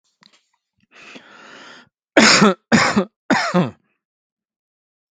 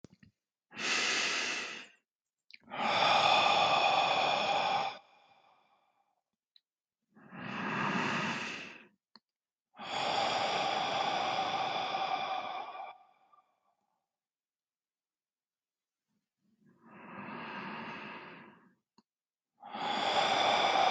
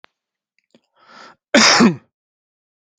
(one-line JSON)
{"three_cough_length": "5.1 s", "three_cough_amplitude": 32768, "three_cough_signal_mean_std_ratio": 0.35, "exhalation_length": "20.9 s", "exhalation_amplitude": 7900, "exhalation_signal_mean_std_ratio": 0.57, "cough_length": "3.0 s", "cough_amplitude": 32768, "cough_signal_mean_std_ratio": 0.3, "survey_phase": "beta (2021-08-13 to 2022-03-07)", "age": "45-64", "gender": "Male", "wearing_mask": "No", "symptom_none": true, "symptom_onset": "12 days", "smoker_status": "Current smoker (e-cigarettes or vapes only)", "respiratory_condition_asthma": false, "respiratory_condition_other": false, "recruitment_source": "REACT", "submission_delay": "1 day", "covid_test_result": "Negative", "covid_test_method": "RT-qPCR", "influenza_a_test_result": "Negative", "influenza_b_test_result": "Negative"}